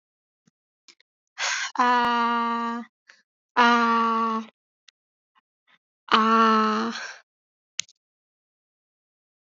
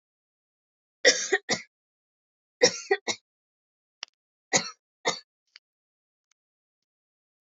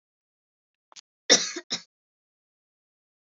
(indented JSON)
{
  "exhalation_length": "9.6 s",
  "exhalation_amplitude": 23298,
  "exhalation_signal_mean_std_ratio": 0.46,
  "three_cough_length": "7.6 s",
  "three_cough_amplitude": 19101,
  "three_cough_signal_mean_std_ratio": 0.23,
  "cough_length": "3.2 s",
  "cough_amplitude": 22855,
  "cough_signal_mean_std_ratio": 0.19,
  "survey_phase": "beta (2021-08-13 to 2022-03-07)",
  "age": "18-44",
  "gender": "Female",
  "wearing_mask": "No",
  "symptom_none": true,
  "smoker_status": "Never smoked",
  "respiratory_condition_asthma": false,
  "respiratory_condition_other": false,
  "recruitment_source": "REACT",
  "submission_delay": "1 day",
  "covid_test_result": "Negative",
  "covid_test_method": "RT-qPCR",
  "influenza_a_test_result": "Negative",
  "influenza_b_test_result": "Negative"
}